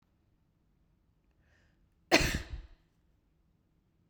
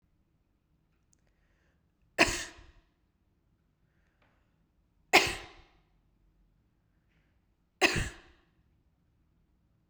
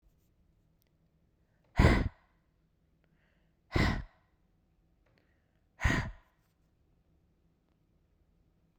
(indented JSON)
{
  "cough_length": "4.1 s",
  "cough_amplitude": 12949,
  "cough_signal_mean_std_ratio": 0.21,
  "three_cough_length": "9.9 s",
  "three_cough_amplitude": 16602,
  "three_cough_signal_mean_std_ratio": 0.19,
  "exhalation_length": "8.8 s",
  "exhalation_amplitude": 9776,
  "exhalation_signal_mean_std_ratio": 0.23,
  "survey_phase": "beta (2021-08-13 to 2022-03-07)",
  "age": "18-44",
  "gender": "Female",
  "wearing_mask": "No",
  "symptom_runny_or_blocked_nose": true,
  "symptom_other": true,
  "symptom_onset": "3 days",
  "smoker_status": "Never smoked",
  "respiratory_condition_asthma": false,
  "respiratory_condition_other": false,
  "recruitment_source": "Test and Trace",
  "submission_delay": "2 days",
  "covid_test_result": "Positive",
  "covid_test_method": "RT-qPCR",
  "covid_ct_value": 23.8,
  "covid_ct_gene": "N gene",
  "covid_ct_mean": 23.9,
  "covid_viral_load": "15000 copies/ml",
  "covid_viral_load_category": "Low viral load (10K-1M copies/ml)"
}